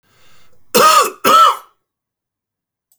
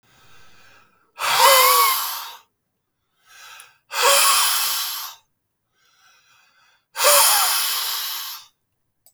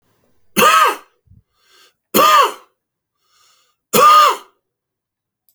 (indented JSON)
{
  "cough_length": "3.0 s",
  "cough_amplitude": 32767,
  "cough_signal_mean_std_ratio": 0.42,
  "exhalation_length": "9.1 s",
  "exhalation_amplitude": 31170,
  "exhalation_signal_mean_std_ratio": 0.49,
  "three_cough_length": "5.5 s",
  "three_cough_amplitude": 32768,
  "three_cough_signal_mean_std_ratio": 0.4,
  "survey_phase": "alpha (2021-03-01 to 2021-08-12)",
  "age": "45-64",
  "gender": "Male",
  "wearing_mask": "No",
  "symptom_cough_any": true,
  "symptom_fatigue": true,
  "symptom_fever_high_temperature": true,
  "symptom_change_to_sense_of_smell_or_taste": true,
  "symptom_loss_of_taste": true,
  "symptom_onset": "3 days",
  "smoker_status": "Ex-smoker",
  "respiratory_condition_asthma": false,
  "respiratory_condition_other": false,
  "recruitment_source": "Test and Trace",
  "submission_delay": "2 days",
  "covid_test_result": "Positive",
  "covid_test_method": "RT-qPCR",
  "covid_ct_value": 15.8,
  "covid_ct_gene": "ORF1ab gene",
  "covid_ct_mean": 16.1,
  "covid_viral_load": "5100000 copies/ml",
  "covid_viral_load_category": "High viral load (>1M copies/ml)"
}